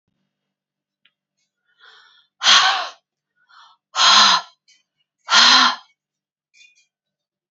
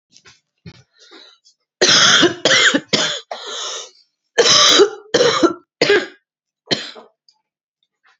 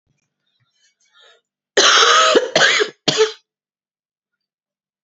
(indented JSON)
{
  "exhalation_length": "7.5 s",
  "exhalation_amplitude": 32767,
  "exhalation_signal_mean_std_ratio": 0.34,
  "three_cough_length": "8.2 s",
  "three_cough_amplitude": 32768,
  "three_cough_signal_mean_std_ratio": 0.46,
  "cough_length": "5.0 s",
  "cough_amplitude": 32767,
  "cough_signal_mean_std_ratio": 0.41,
  "survey_phase": "beta (2021-08-13 to 2022-03-07)",
  "age": "45-64",
  "gender": "Female",
  "wearing_mask": "Yes",
  "symptom_cough_any": true,
  "symptom_runny_or_blocked_nose": true,
  "symptom_abdominal_pain": true,
  "symptom_diarrhoea": true,
  "symptom_fatigue": true,
  "symptom_onset": "5 days",
  "smoker_status": "Never smoked",
  "respiratory_condition_asthma": false,
  "respiratory_condition_other": false,
  "recruitment_source": "Test and Trace",
  "submission_delay": "3 days",
  "covid_test_result": "Positive",
  "covid_test_method": "RT-qPCR",
  "covid_ct_value": 26.4,
  "covid_ct_gene": "ORF1ab gene",
  "covid_ct_mean": 27.1,
  "covid_viral_load": "1300 copies/ml",
  "covid_viral_load_category": "Minimal viral load (< 10K copies/ml)"
}